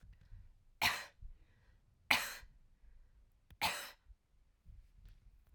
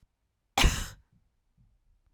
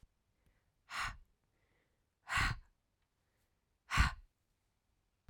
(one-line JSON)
{"three_cough_length": "5.5 s", "three_cough_amplitude": 8350, "three_cough_signal_mean_std_ratio": 0.32, "cough_length": "2.1 s", "cough_amplitude": 10694, "cough_signal_mean_std_ratio": 0.26, "exhalation_length": "5.3 s", "exhalation_amplitude": 4700, "exhalation_signal_mean_std_ratio": 0.27, "survey_phase": "beta (2021-08-13 to 2022-03-07)", "age": "18-44", "gender": "Female", "wearing_mask": "No", "symptom_runny_or_blocked_nose": true, "symptom_sore_throat": true, "symptom_fatigue": true, "symptom_headache": true, "symptom_onset": "4 days", "smoker_status": "Never smoked", "respiratory_condition_asthma": false, "respiratory_condition_other": false, "recruitment_source": "Test and Trace", "submission_delay": "2 days", "covid_test_result": "Positive", "covid_test_method": "RT-qPCR", "covid_ct_value": 24.7, "covid_ct_gene": "N gene"}